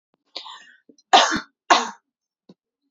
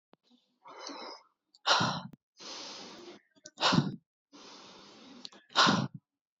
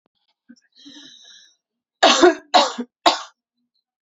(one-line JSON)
{"cough_length": "2.9 s", "cough_amplitude": 32768, "cough_signal_mean_std_ratio": 0.29, "exhalation_length": "6.4 s", "exhalation_amplitude": 9337, "exhalation_signal_mean_std_ratio": 0.37, "three_cough_length": "4.0 s", "three_cough_amplitude": 28951, "three_cough_signal_mean_std_ratio": 0.31, "survey_phase": "beta (2021-08-13 to 2022-03-07)", "age": "18-44", "gender": "Female", "wearing_mask": "No", "symptom_runny_or_blocked_nose": true, "symptom_headache": true, "smoker_status": "Ex-smoker", "respiratory_condition_asthma": false, "respiratory_condition_other": false, "recruitment_source": "Test and Trace", "submission_delay": "1 day", "covid_test_result": "Positive", "covid_test_method": "RT-qPCR", "covid_ct_value": 39.5, "covid_ct_gene": "ORF1ab gene"}